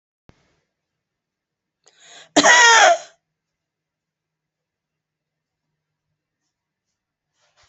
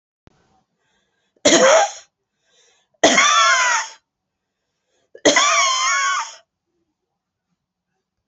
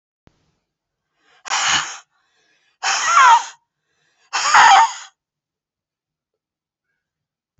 cough_length: 7.7 s
cough_amplitude: 32148
cough_signal_mean_std_ratio: 0.23
three_cough_length: 8.3 s
three_cough_amplitude: 32374
three_cough_signal_mean_std_ratio: 0.44
exhalation_length: 7.6 s
exhalation_amplitude: 30651
exhalation_signal_mean_std_ratio: 0.34
survey_phase: beta (2021-08-13 to 2022-03-07)
age: 65+
gender: Female
wearing_mask: 'No'
symptom_none: true
smoker_status: Ex-smoker
respiratory_condition_asthma: false
respiratory_condition_other: false
recruitment_source: REACT
submission_delay: 3 days
covid_test_result: Negative
covid_test_method: RT-qPCR
influenza_a_test_result: Negative
influenza_b_test_result: Negative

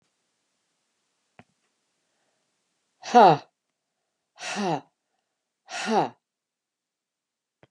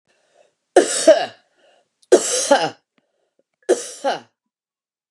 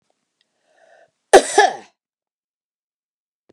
exhalation_length: 7.7 s
exhalation_amplitude: 23894
exhalation_signal_mean_std_ratio: 0.21
three_cough_length: 5.1 s
three_cough_amplitude: 32557
three_cough_signal_mean_std_ratio: 0.34
cough_length: 3.5 s
cough_amplitude: 32768
cough_signal_mean_std_ratio: 0.21
survey_phase: beta (2021-08-13 to 2022-03-07)
age: 65+
gender: Female
wearing_mask: 'No'
symptom_none: true
smoker_status: Ex-smoker
respiratory_condition_asthma: false
respiratory_condition_other: false
recruitment_source: REACT
submission_delay: 1 day
covid_test_result: Negative
covid_test_method: RT-qPCR
influenza_a_test_result: Negative
influenza_b_test_result: Negative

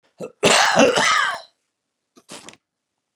cough_length: 3.2 s
cough_amplitude: 28579
cough_signal_mean_std_ratio: 0.45
survey_phase: beta (2021-08-13 to 2022-03-07)
age: 65+
gender: Male
wearing_mask: 'No'
symptom_runny_or_blocked_nose: true
symptom_sore_throat: true
smoker_status: Ex-smoker
respiratory_condition_asthma: false
respiratory_condition_other: false
recruitment_source: REACT
submission_delay: 1 day
covid_test_result: Negative
covid_test_method: RT-qPCR
influenza_a_test_result: Negative
influenza_b_test_result: Negative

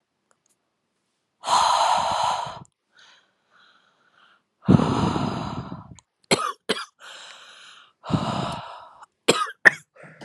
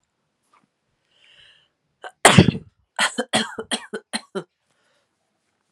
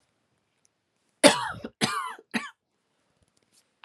exhalation_length: 10.2 s
exhalation_amplitude: 32768
exhalation_signal_mean_std_ratio: 0.41
cough_length: 5.7 s
cough_amplitude: 32768
cough_signal_mean_std_ratio: 0.24
three_cough_length: 3.8 s
three_cough_amplitude: 32430
three_cough_signal_mean_std_ratio: 0.25
survey_phase: alpha (2021-03-01 to 2021-08-12)
age: 18-44
gender: Female
wearing_mask: 'No'
symptom_cough_any: true
symptom_new_continuous_cough: true
symptom_shortness_of_breath: true
symptom_fatigue: true
symptom_fever_high_temperature: true
symptom_headache: true
smoker_status: Current smoker (1 to 10 cigarettes per day)
respiratory_condition_asthma: false
respiratory_condition_other: false
recruitment_source: Test and Trace
submission_delay: 1 day
covid_test_result: Positive
covid_test_method: RT-qPCR
covid_ct_value: 16.3
covid_ct_gene: ORF1ab gene
covid_ct_mean: 16.8
covid_viral_load: 3200000 copies/ml
covid_viral_load_category: High viral load (>1M copies/ml)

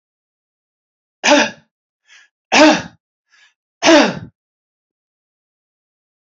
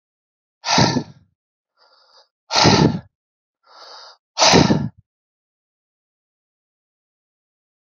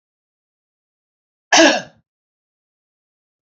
three_cough_length: 6.3 s
three_cough_amplitude: 32767
three_cough_signal_mean_std_ratio: 0.29
exhalation_length: 7.9 s
exhalation_amplitude: 29731
exhalation_signal_mean_std_ratio: 0.32
cough_length: 3.4 s
cough_amplitude: 32768
cough_signal_mean_std_ratio: 0.22
survey_phase: beta (2021-08-13 to 2022-03-07)
age: 65+
gender: Male
wearing_mask: 'No'
symptom_none: true
smoker_status: Never smoked
respiratory_condition_asthma: false
respiratory_condition_other: false
recruitment_source: REACT
submission_delay: 10 days
covid_test_result: Negative
covid_test_method: RT-qPCR
influenza_a_test_result: Negative
influenza_b_test_result: Negative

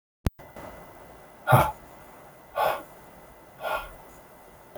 exhalation_length: 4.8 s
exhalation_amplitude: 19692
exhalation_signal_mean_std_ratio: 0.35
survey_phase: beta (2021-08-13 to 2022-03-07)
age: 45-64
gender: Male
wearing_mask: 'No'
symptom_none: true
smoker_status: Never smoked
respiratory_condition_asthma: false
respiratory_condition_other: false
recruitment_source: Test and Trace
submission_delay: 2 days
covid_test_result: Positive
covid_test_method: LFT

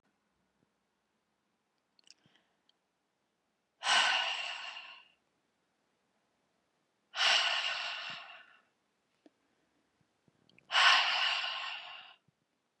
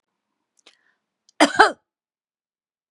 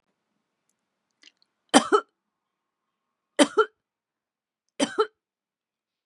exhalation_length: 12.8 s
exhalation_amplitude: 8669
exhalation_signal_mean_std_ratio: 0.35
cough_length: 2.9 s
cough_amplitude: 32767
cough_signal_mean_std_ratio: 0.2
three_cough_length: 6.1 s
three_cough_amplitude: 31669
three_cough_signal_mean_std_ratio: 0.2
survey_phase: beta (2021-08-13 to 2022-03-07)
age: 45-64
gender: Female
wearing_mask: 'No'
symptom_runny_or_blocked_nose: true
symptom_sore_throat: true
symptom_onset: 4 days
smoker_status: Never smoked
respiratory_condition_asthma: false
respiratory_condition_other: false
recruitment_source: REACT
submission_delay: 1 day
covid_test_result: Negative
covid_test_method: RT-qPCR
influenza_a_test_result: Negative
influenza_b_test_result: Negative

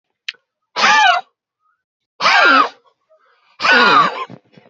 exhalation_length: 4.7 s
exhalation_amplitude: 32767
exhalation_signal_mean_std_ratio: 0.49
survey_phase: beta (2021-08-13 to 2022-03-07)
age: 18-44
gender: Male
wearing_mask: 'No'
symptom_none: true
symptom_onset: 3 days
smoker_status: Never smoked
respiratory_condition_asthma: false
respiratory_condition_other: false
recruitment_source: Test and Trace
submission_delay: 2 days
covid_test_result: Positive
covid_test_method: RT-qPCR
covid_ct_value: 23.6
covid_ct_gene: ORF1ab gene
covid_ct_mean: 23.9
covid_viral_load: 14000 copies/ml
covid_viral_load_category: Low viral load (10K-1M copies/ml)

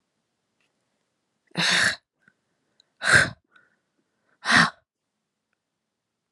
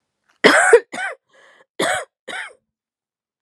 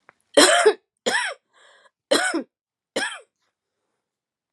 exhalation_length: 6.3 s
exhalation_amplitude: 21061
exhalation_signal_mean_std_ratio: 0.28
cough_length: 3.4 s
cough_amplitude: 32768
cough_signal_mean_std_ratio: 0.34
three_cough_length: 4.5 s
three_cough_amplitude: 31939
three_cough_signal_mean_std_ratio: 0.36
survey_phase: alpha (2021-03-01 to 2021-08-12)
age: 45-64
gender: Female
wearing_mask: 'No'
symptom_cough_any: true
symptom_shortness_of_breath: true
symptom_fatigue: true
symptom_headache: true
symptom_onset: 4 days
smoker_status: Ex-smoker
respiratory_condition_asthma: false
respiratory_condition_other: false
recruitment_source: Test and Trace
submission_delay: 3 days
covid_test_result: Positive
covid_test_method: RT-qPCR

